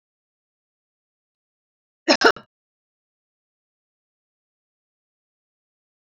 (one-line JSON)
{"cough_length": "6.1 s", "cough_amplitude": 28161, "cough_signal_mean_std_ratio": 0.13, "survey_phase": "beta (2021-08-13 to 2022-03-07)", "age": "65+", "gender": "Female", "wearing_mask": "No", "symptom_none": true, "smoker_status": "Never smoked", "respiratory_condition_asthma": false, "respiratory_condition_other": false, "recruitment_source": "REACT", "submission_delay": "1 day", "covid_test_result": "Negative", "covid_test_method": "RT-qPCR"}